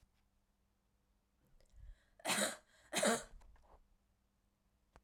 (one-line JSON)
{"cough_length": "5.0 s", "cough_amplitude": 2770, "cough_signal_mean_std_ratio": 0.3, "survey_phase": "alpha (2021-03-01 to 2021-08-12)", "age": "18-44", "gender": "Female", "wearing_mask": "No", "symptom_cough_any": true, "symptom_fatigue": true, "symptom_headache": true, "symptom_onset": "6 days", "smoker_status": "Never smoked", "respiratory_condition_asthma": false, "respiratory_condition_other": false, "recruitment_source": "Test and Trace", "submission_delay": "2 days", "covid_test_result": "Positive", "covid_test_method": "RT-qPCR", "covid_ct_value": 16.1, "covid_ct_gene": "ORF1ab gene", "covid_ct_mean": 17.5, "covid_viral_load": "1800000 copies/ml", "covid_viral_load_category": "High viral load (>1M copies/ml)"}